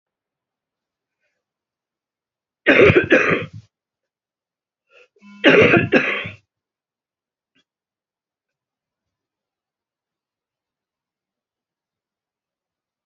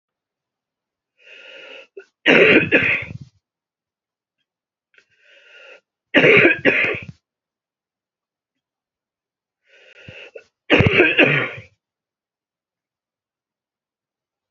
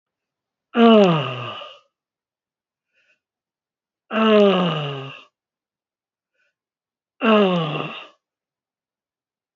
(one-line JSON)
{"cough_length": "13.1 s", "cough_amplitude": 28396, "cough_signal_mean_std_ratio": 0.25, "three_cough_length": "14.5 s", "three_cough_amplitude": 30038, "three_cough_signal_mean_std_ratio": 0.31, "exhalation_length": "9.6 s", "exhalation_amplitude": 26268, "exhalation_signal_mean_std_ratio": 0.36, "survey_phase": "beta (2021-08-13 to 2022-03-07)", "age": "65+", "gender": "Female", "wearing_mask": "No", "symptom_none": true, "smoker_status": "Never smoked", "respiratory_condition_asthma": true, "respiratory_condition_other": true, "recruitment_source": "REACT", "submission_delay": "2 days", "covid_test_result": "Negative", "covid_test_method": "RT-qPCR", "influenza_a_test_result": "Negative", "influenza_b_test_result": "Negative"}